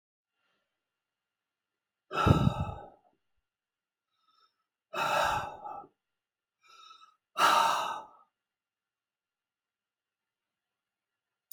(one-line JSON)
{"exhalation_length": "11.5 s", "exhalation_amplitude": 11992, "exhalation_signal_mean_std_ratio": 0.3, "survey_phase": "alpha (2021-03-01 to 2021-08-12)", "age": "65+", "gender": "Male", "wearing_mask": "No", "symptom_none": true, "smoker_status": "Never smoked", "respiratory_condition_asthma": false, "respiratory_condition_other": false, "recruitment_source": "REACT", "submission_delay": "1 day", "covid_test_result": "Negative", "covid_test_method": "RT-qPCR"}